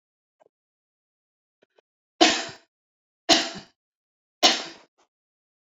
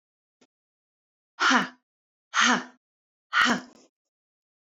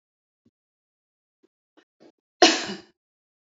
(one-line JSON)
{"three_cough_length": "5.7 s", "three_cough_amplitude": 26531, "three_cough_signal_mean_std_ratio": 0.24, "exhalation_length": "4.6 s", "exhalation_amplitude": 16887, "exhalation_signal_mean_std_ratio": 0.33, "cough_length": "3.5 s", "cough_amplitude": 26071, "cough_signal_mean_std_ratio": 0.18, "survey_phase": "beta (2021-08-13 to 2022-03-07)", "age": "45-64", "gender": "Female", "wearing_mask": "No", "symptom_none": true, "smoker_status": "Never smoked", "respiratory_condition_asthma": true, "respiratory_condition_other": false, "recruitment_source": "REACT", "submission_delay": "1 day", "covid_test_result": "Negative", "covid_test_method": "RT-qPCR"}